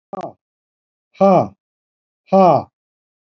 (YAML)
exhalation_length: 3.3 s
exhalation_amplitude: 28121
exhalation_signal_mean_std_ratio: 0.33
survey_phase: beta (2021-08-13 to 2022-03-07)
age: 65+
gender: Male
wearing_mask: 'No'
symptom_sore_throat: true
symptom_headache: true
symptom_onset: 12 days
smoker_status: Never smoked
respiratory_condition_asthma: false
respiratory_condition_other: false
recruitment_source: REACT
submission_delay: 4 days
covid_test_result: Negative
covid_test_method: RT-qPCR
influenza_a_test_result: Negative
influenza_b_test_result: Negative